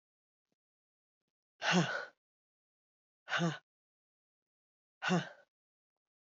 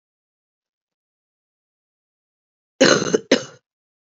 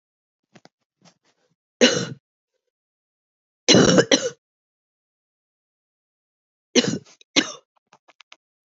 {
  "exhalation_length": "6.2 s",
  "exhalation_amplitude": 5004,
  "exhalation_signal_mean_std_ratio": 0.29,
  "cough_length": "4.2 s",
  "cough_amplitude": 32767,
  "cough_signal_mean_std_ratio": 0.23,
  "three_cough_length": "8.8 s",
  "three_cough_amplitude": 29584,
  "three_cough_signal_mean_std_ratio": 0.25,
  "survey_phase": "alpha (2021-03-01 to 2021-08-12)",
  "age": "18-44",
  "gender": "Female",
  "wearing_mask": "No",
  "symptom_cough_any": true,
  "symptom_onset": "3 days",
  "smoker_status": "Ex-smoker",
  "respiratory_condition_asthma": false,
  "respiratory_condition_other": false,
  "recruitment_source": "Test and Trace",
  "submission_delay": "2 days",
  "covid_test_result": "Positive",
  "covid_test_method": "RT-qPCR",
  "covid_ct_value": 18.8,
  "covid_ct_gene": "ORF1ab gene",
  "covid_ct_mean": 19.0,
  "covid_viral_load": "600000 copies/ml",
  "covid_viral_load_category": "Low viral load (10K-1M copies/ml)"
}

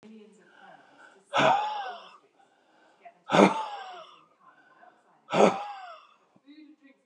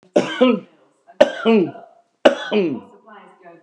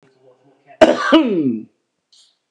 {
  "exhalation_length": "7.1 s",
  "exhalation_amplitude": 24737,
  "exhalation_signal_mean_std_ratio": 0.33,
  "three_cough_length": "3.6 s",
  "three_cough_amplitude": 32768,
  "three_cough_signal_mean_std_ratio": 0.43,
  "cough_length": "2.5 s",
  "cough_amplitude": 32768,
  "cough_signal_mean_std_ratio": 0.41,
  "survey_phase": "beta (2021-08-13 to 2022-03-07)",
  "age": "45-64",
  "gender": "Male",
  "wearing_mask": "No",
  "symptom_shortness_of_breath": true,
  "symptom_fatigue": true,
  "smoker_status": "Never smoked",
  "respiratory_condition_asthma": true,
  "respiratory_condition_other": false,
  "recruitment_source": "REACT",
  "submission_delay": "11 days",
  "covid_test_result": "Negative",
  "covid_test_method": "RT-qPCR"
}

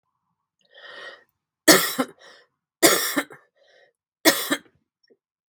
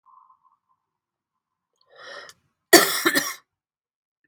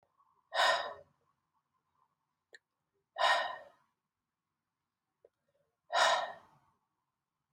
{
  "three_cough_length": "5.5 s",
  "three_cough_amplitude": 32767,
  "three_cough_signal_mean_std_ratio": 0.3,
  "cough_length": "4.3 s",
  "cough_amplitude": 32768,
  "cough_signal_mean_std_ratio": 0.23,
  "exhalation_length": "7.5 s",
  "exhalation_amplitude": 5565,
  "exhalation_signal_mean_std_ratio": 0.3,
  "survey_phase": "beta (2021-08-13 to 2022-03-07)",
  "age": "45-64",
  "gender": "Female",
  "wearing_mask": "No",
  "symptom_cough_any": true,
  "symptom_runny_or_blocked_nose": true,
  "symptom_fatigue": true,
  "symptom_change_to_sense_of_smell_or_taste": true,
  "smoker_status": "Never smoked",
  "respiratory_condition_asthma": false,
  "respiratory_condition_other": false,
  "recruitment_source": "Test and Trace",
  "submission_delay": "1 day",
  "covid_test_result": "Positive",
  "covid_test_method": "RT-qPCR",
  "covid_ct_value": 18.6,
  "covid_ct_gene": "ORF1ab gene"
}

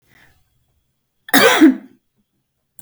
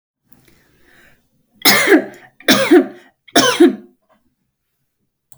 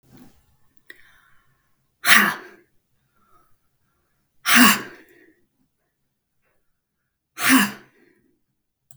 {
  "cough_length": "2.8 s",
  "cough_amplitude": 32768,
  "cough_signal_mean_std_ratio": 0.31,
  "three_cough_length": "5.4 s",
  "three_cough_amplitude": 32768,
  "three_cough_signal_mean_std_ratio": 0.37,
  "exhalation_length": "9.0 s",
  "exhalation_amplitude": 32768,
  "exhalation_signal_mean_std_ratio": 0.25,
  "survey_phase": "beta (2021-08-13 to 2022-03-07)",
  "age": "18-44",
  "gender": "Female",
  "wearing_mask": "No",
  "symptom_none": true,
  "smoker_status": "Ex-smoker",
  "respiratory_condition_asthma": false,
  "respiratory_condition_other": false,
  "recruitment_source": "REACT",
  "submission_delay": "2 days",
  "covid_test_result": "Negative",
  "covid_test_method": "RT-qPCR",
  "influenza_a_test_result": "Negative",
  "influenza_b_test_result": "Negative"
}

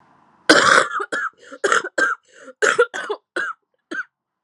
{
  "cough_length": "4.4 s",
  "cough_amplitude": 32768,
  "cough_signal_mean_std_ratio": 0.46,
  "survey_phase": "alpha (2021-03-01 to 2021-08-12)",
  "age": "18-44",
  "gender": "Female",
  "wearing_mask": "No",
  "symptom_cough_any": true,
  "symptom_new_continuous_cough": true,
  "symptom_abdominal_pain": true,
  "symptom_fatigue": true,
  "symptom_fever_high_temperature": true,
  "symptom_headache": true,
  "symptom_change_to_sense_of_smell_or_taste": true,
  "symptom_onset": "3 days",
  "smoker_status": "Ex-smoker",
  "respiratory_condition_asthma": true,
  "respiratory_condition_other": false,
  "recruitment_source": "Test and Trace",
  "submission_delay": "1 day",
  "covid_test_result": "Positive",
  "covid_test_method": "RT-qPCR",
  "covid_ct_value": 12.6,
  "covid_ct_gene": "ORF1ab gene",
  "covid_ct_mean": 13.2,
  "covid_viral_load": "48000000 copies/ml",
  "covid_viral_load_category": "High viral load (>1M copies/ml)"
}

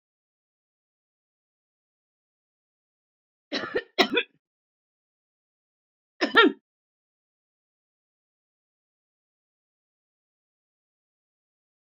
{
  "three_cough_length": "11.9 s",
  "three_cough_amplitude": 20840,
  "three_cough_signal_mean_std_ratio": 0.16,
  "survey_phase": "beta (2021-08-13 to 2022-03-07)",
  "age": "45-64",
  "gender": "Female",
  "wearing_mask": "No",
  "symptom_new_continuous_cough": true,
  "symptom_other": true,
  "smoker_status": "Ex-smoker",
  "respiratory_condition_asthma": false,
  "respiratory_condition_other": false,
  "recruitment_source": "Test and Trace",
  "submission_delay": "2 days",
  "covid_test_result": "Positive",
  "covid_test_method": "RT-qPCR",
  "covid_ct_value": 29.8,
  "covid_ct_gene": "ORF1ab gene"
}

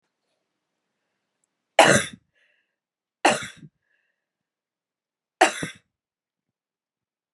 {
  "three_cough_length": "7.3 s",
  "three_cough_amplitude": 32530,
  "three_cough_signal_mean_std_ratio": 0.2,
  "survey_phase": "beta (2021-08-13 to 2022-03-07)",
  "age": "18-44",
  "gender": "Female",
  "wearing_mask": "No",
  "symptom_cough_any": true,
  "symptom_runny_or_blocked_nose": true,
  "symptom_sore_throat": true,
  "symptom_fatigue": true,
  "symptom_fever_high_temperature": true,
  "symptom_change_to_sense_of_smell_or_taste": true,
  "symptom_onset": "3 days",
  "smoker_status": "Never smoked",
  "respiratory_condition_asthma": false,
  "respiratory_condition_other": false,
  "recruitment_source": "Test and Trace",
  "submission_delay": "2 days",
  "covid_test_result": "Positive",
  "covid_test_method": "RT-qPCR",
  "covid_ct_value": 30.0,
  "covid_ct_gene": "ORF1ab gene",
  "covid_ct_mean": 31.1,
  "covid_viral_load": "61 copies/ml",
  "covid_viral_load_category": "Minimal viral load (< 10K copies/ml)"
}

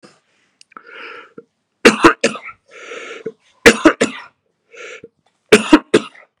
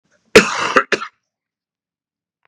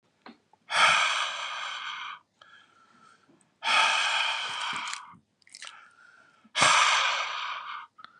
{
  "three_cough_length": "6.4 s",
  "three_cough_amplitude": 32768,
  "three_cough_signal_mean_std_ratio": 0.29,
  "cough_length": "2.5 s",
  "cough_amplitude": 32768,
  "cough_signal_mean_std_ratio": 0.29,
  "exhalation_length": "8.2 s",
  "exhalation_amplitude": 13655,
  "exhalation_signal_mean_std_ratio": 0.54,
  "survey_phase": "beta (2021-08-13 to 2022-03-07)",
  "age": "18-44",
  "gender": "Male",
  "wearing_mask": "No",
  "symptom_cough_any": true,
  "symptom_runny_or_blocked_nose": true,
  "smoker_status": "Ex-smoker",
  "respiratory_condition_asthma": false,
  "respiratory_condition_other": false,
  "recruitment_source": "REACT",
  "submission_delay": "3 days",
  "covid_test_result": "Negative",
  "covid_test_method": "RT-qPCR",
  "influenza_a_test_result": "Unknown/Void",
  "influenza_b_test_result": "Unknown/Void"
}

